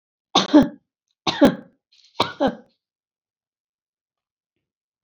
{"three_cough_length": "5.0 s", "three_cough_amplitude": 27403, "three_cough_signal_mean_std_ratio": 0.26, "survey_phase": "beta (2021-08-13 to 2022-03-07)", "age": "65+", "gender": "Female", "wearing_mask": "No", "symptom_none": true, "smoker_status": "Never smoked", "respiratory_condition_asthma": false, "respiratory_condition_other": false, "recruitment_source": "REACT", "submission_delay": "-1 day", "covid_test_result": "Negative", "covid_test_method": "RT-qPCR", "influenza_a_test_result": "Negative", "influenza_b_test_result": "Negative"}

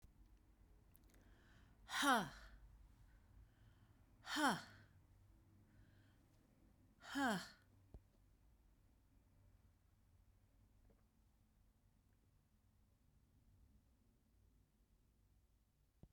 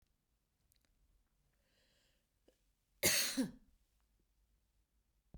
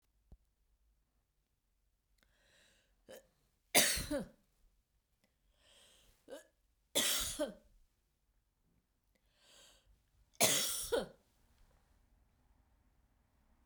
{"exhalation_length": "16.1 s", "exhalation_amplitude": 2047, "exhalation_signal_mean_std_ratio": 0.26, "cough_length": "5.4 s", "cough_amplitude": 4060, "cough_signal_mean_std_ratio": 0.24, "three_cough_length": "13.7 s", "three_cough_amplitude": 7723, "three_cough_signal_mean_std_ratio": 0.27, "survey_phase": "beta (2021-08-13 to 2022-03-07)", "age": "65+", "gender": "Female", "wearing_mask": "No", "symptom_none": true, "smoker_status": "Never smoked", "respiratory_condition_asthma": false, "respiratory_condition_other": false, "recruitment_source": "REACT", "submission_delay": "2 days", "covid_test_result": "Negative", "covid_test_method": "RT-qPCR"}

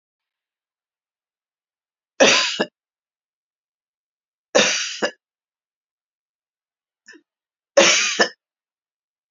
{"three_cough_length": "9.3 s", "three_cough_amplitude": 29416, "three_cough_signal_mean_std_ratio": 0.28, "survey_phase": "beta (2021-08-13 to 2022-03-07)", "age": "65+", "gender": "Female", "wearing_mask": "No", "symptom_cough_any": true, "symptom_runny_or_blocked_nose": true, "symptom_onset": "12 days", "smoker_status": "Ex-smoker", "respiratory_condition_asthma": false, "respiratory_condition_other": true, "recruitment_source": "REACT", "submission_delay": "1 day", "covid_test_result": "Negative", "covid_test_method": "RT-qPCR", "influenza_a_test_result": "Negative", "influenza_b_test_result": "Negative"}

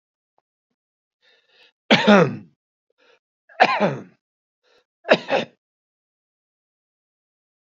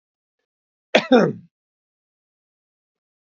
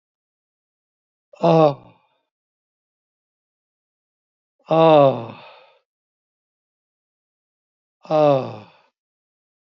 {"three_cough_length": "7.8 s", "three_cough_amplitude": 32768, "three_cough_signal_mean_std_ratio": 0.26, "cough_length": "3.2 s", "cough_amplitude": 27416, "cough_signal_mean_std_ratio": 0.22, "exhalation_length": "9.7 s", "exhalation_amplitude": 26451, "exhalation_signal_mean_std_ratio": 0.27, "survey_phase": "beta (2021-08-13 to 2022-03-07)", "age": "65+", "gender": "Male", "wearing_mask": "No", "symptom_none": true, "smoker_status": "Never smoked", "respiratory_condition_asthma": false, "respiratory_condition_other": false, "recruitment_source": "REACT", "submission_delay": "1 day", "covid_test_result": "Negative", "covid_test_method": "RT-qPCR", "influenza_a_test_result": "Unknown/Void", "influenza_b_test_result": "Unknown/Void"}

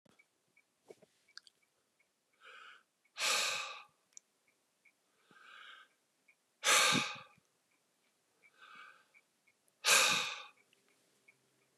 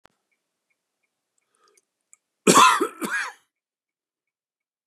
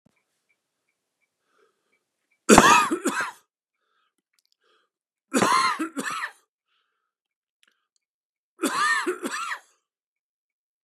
{"exhalation_length": "11.8 s", "exhalation_amplitude": 7211, "exhalation_signal_mean_std_ratio": 0.29, "cough_length": "4.9 s", "cough_amplitude": 27719, "cough_signal_mean_std_ratio": 0.25, "three_cough_length": "10.8 s", "three_cough_amplitude": 32768, "three_cough_signal_mean_std_ratio": 0.31, "survey_phase": "beta (2021-08-13 to 2022-03-07)", "age": "65+", "gender": "Male", "wearing_mask": "No", "symptom_none": true, "smoker_status": "Never smoked", "respiratory_condition_asthma": false, "respiratory_condition_other": false, "recruitment_source": "REACT", "submission_delay": "4 days", "covid_test_result": "Negative", "covid_test_method": "RT-qPCR", "influenza_a_test_result": "Negative", "influenza_b_test_result": "Negative"}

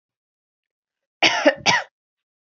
{"three_cough_length": "2.6 s", "three_cough_amplitude": 27326, "three_cough_signal_mean_std_ratio": 0.32, "survey_phase": "beta (2021-08-13 to 2022-03-07)", "age": "18-44", "gender": "Female", "wearing_mask": "No", "symptom_none": true, "smoker_status": "Never smoked", "respiratory_condition_asthma": false, "respiratory_condition_other": false, "recruitment_source": "REACT", "submission_delay": "1 day", "covid_test_result": "Negative", "covid_test_method": "RT-qPCR"}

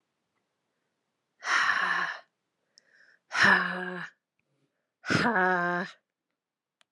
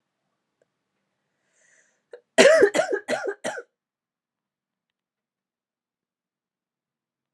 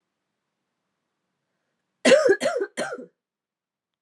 {"exhalation_length": "6.9 s", "exhalation_amplitude": 11551, "exhalation_signal_mean_std_ratio": 0.42, "cough_length": "7.3 s", "cough_amplitude": 30094, "cough_signal_mean_std_ratio": 0.24, "three_cough_length": "4.0 s", "three_cough_amplitude": 19622, "three_cough_signal_mean_std_ratio": 0.31, "survey_phase": "alpha (2021-03-01 to 2021-08-12)", "age": "18-44", "gender": "Female", "wearing_mask": "No", "symptom_cough_any": true, "symptom_shortness_of_breath": true, "symptom_fatigue": true, "symptom_onset": "7 days", "smoker_status": "Never smoked", "respiratory_condition_asthma": false, "respiratory_condition_other": false, "recruitment_source": "Test and Trace", "submission_delay": "2 days", "covid_test_result": "Positive", "covid_test_method": "RT-qPCR", "covid_ct_value": 30.3, "covid_ct_gene": "N gene"}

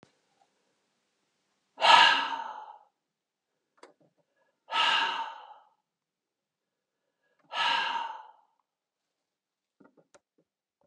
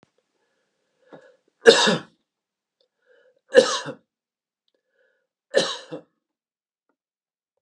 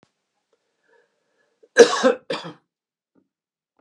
{"exhalation_length": "10.9 s", "exhalation_amplitude": 17572, "exhalation_signal_mean_std_ratio": 0.28, "three_cough_length": "7.6 s", "three_cough_amplitude": 32768, "three_cough_signal_mean_std_ratio": 0.22, "cough_length": "3.8 s", "cough_amplitude": 32768, "cough_signal_mean_std_ratio": 0.21, "survey_phase": "beta (2021-08-13 to 2022-03-07)", "age": "65+", "gender": "Male", "wearing_mask": "No", "symptom_none": true, "smoker_status": "Never smoked", "respiratory_condition_asthma": false, "respiratory_condition_other": false, "recruitment_source": "REACT", "submission_delay": "1 day", "covid_test_result": "Negative", "covid_test_method": "RT-qPCR"}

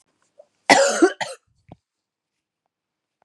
{"cough_length": "3.2 s", "cough_amplitude": 32767, "cough_signal_mean_std_ratio": 0.28, "survey_phase": "beta (2021-08-13 to 2022-03-07)", "age": "45-64", "gender": "Female", "wearing_mask": "No", "symptom_cough_any": true, "symptom_runny_or_blocked_nose": true, "symptom_shortness_of_breath": true, "symptom_fatigue": true, "symptom_fever_high_temperature": true, "symptom_headache": true, "symptom_onset": "4 days", "smoker_status": "Never smoked", "respiratory_condition_asthma": false, "respiratory_condition_other": false, "recruitment_source": "Test and Trace", "submission_delay": "2 days", "covid_test_result": "Positive", "covid_test_method": "ePCR"}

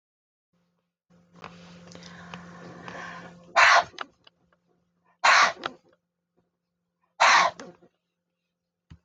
{"exhalation_length": "9.0 s", "exhalation_amplitude": 18493, "exhalation_signal_mean_std_ratio": 0.29, "survey_phase": "beta (2021-08-13 to 2022-03-07)", "age": "45-64", "gender": "Female", "wearing_mask": "No", "symptom_none": true, "smoker_status": "Ex-smoker", "respiratory_condition_asthma": false, "respiratory_condition_other": false, "recruitment_source": "REACT", "submission_delay": "1 day", "covid_test_result": "Negative", "covid_test_method": "RT-qPCR"}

